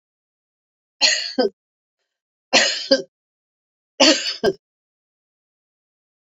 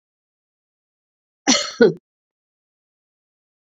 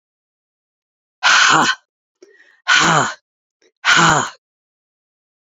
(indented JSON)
{
  "three_cough_length": "6.4 s",
  "three_cough_amplitude": 30806,
  "three_cough_signal_mean_std_ratio": 0.32,
  "cough_length": "3.7 s",
  "cough_amplitude": 28293,
  "cough_signal_mean_std_ratio": 0.22,
  "exhalation_length": "5.5 s",
  "exhalation_amplitude": 30550,
  "exhalation_signal_mean_std_ratio": 0.41,
  "survey_phase": "beta (2021-08-13 to 2022-03-07)",
  "age": "65+",
  "gender": "Female",
  "wearing_mask": "No",
  "symptom_none": true,
  "smoker_status": "Never smoked",
  "respiratory_condition_asthma": false,
  "respiratory_condition_other": false,
  "recruitment_source": "REACT",
  "submission_delay": "2 days",
  "covid_test_result": "Negative",
  "covid_test_method": "RT-qPCR",
  "influenza_a_test_result": "Negative",
  "influenza_b_test_result": "Negative"
}